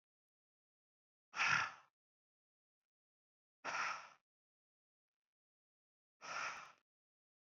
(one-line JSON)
{"exhalation_length": "7.5 s", "exhalation_amplitude": 2655, "exhalation_signal_mean_std_ratio": 0.28, "survey_phase": "beta (2021-08-13 to 2022-03-07)", "age": "45-64", "gender": "Male", "wearing_mask": "No", "symptom_none": true, "symptom_onset": "7 days", "smoker_status": "Current smoker (1 to 10 cigarettes per day)", "respiratory_condition_asthma": false, "respiratory_condition_other": false, "recruitment_source": "REACT", "submission_delay": "2 days", "covid_test_result": "Negative", "covid_test_method": "RT-qPCR"}